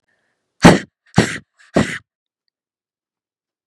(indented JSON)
{
  "exhalation_length": "3.7 s",
  "exhalation_amplitude": 32768,
  "exhalation_signal_mean_std_ratio": 0.24,
  "survey_phase": "beta (2021-08-13 to 2022-03-07)",
  "age": "45-64",
  "gender": "Female",
  "wearing_mask": "No",
  "symptom_new_continuous_cough": true,
  "symptom_runny_or_blocked_nose": true,
  "symptom_sore_throat": true,
  "symptom_fatigue": true,
  "symptom_headache": true,
  "symptom_change_to_sense_of_smell_or_taste": true,
  "smoker_status": "Never smoked",
  "respiratory_condition_asthma": false,
  "respiratory_condition_other": false,
  "recruitment_source": "Test and Trace",
  "submission_delay": "1 day",
  "covid_test_result": "Positive",
  "covid_test_method": "RT-qPCR"
}